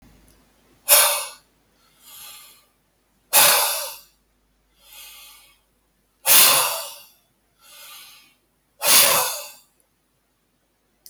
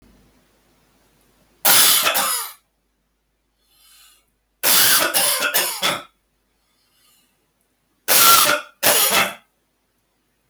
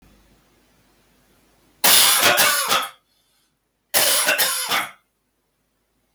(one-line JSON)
{"exhalation_length": "11.1 s", "exhalation_amplitude": 32766, "exhalation_signal_mean_std_ratio": 0.32, "three_cough_length": "10.5 s", "three_cough_amplitude": 32768, "three_cough_signal_mean_std_ratio": 0.38, "cough_length": "6.1 s", "cough_amplitude": 32767, "cough_signal_mean_std_ratio": 0.41, "survey_phase": "beta (2021-08-13 to 2022-03-07)", "age": "45-64", "gender": "Male", "wearing_mask": "No", "symptom_none": true, "smoker_status": "Ex-smoker", "respiratory_condition_asthma": false, "respiratory_condition_other": false, "recruitment_source": "REACT", "submission_delay": "2 days", "covid_test_result": "Negative", "covid_test_method": "RT-qPCR", "influenza_a_test_result": "Negative", "influenza_b_test_result": "Negative"}